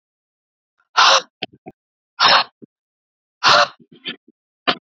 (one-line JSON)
{"exhalation_length": "4.9 s", "exhalation_amplitude": 31016, "exhalation_signal_mean_std_ratio": 0.33, "survey_phase": "beta (2021-08-13 to 2022-03-07)", "age": "18-44", "gender": "Female", "wearing_mask": "No", "symptom_cough_any": true, "symptom_shortness_of_breath": true, "symptom_sore_throat": true, "symptom_fatigue": true, "symptom_headache": true, "symptom_onset": "8 days", "smoker_status": "Ex-smoker", "respiratory_condition_asthma": true, "respiratory_condition_other": false, "recruitment_source": "Test and Trace", "submission_delay": "3 days", "covid_test_result": "Positive", "covid_test_method": "ePCR"}